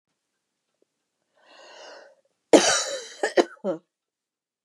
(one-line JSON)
{"cough_length": "4.6 s", "cough_amplitude": 29502, "cough_signal_mean_std_ratio": 0.26, "survey_phase": "beta (2021-08-13 to 2022-03-07)", "age": "45-64", "gender": "Female", "wearing_mask": "No", "symptom_none": true, "smoker_status": "Never smoked", "respiratory_condition_asthma": false, "respiratory_condition_other": false, "recruitment_source": "REACT", "submission_delay": "3 days", "covid_test_result": "Negative", "covid_test_method": "RT-qPCR", "influenza_a_test_result": "Negative", "influenza_b_test_result": "Negative"}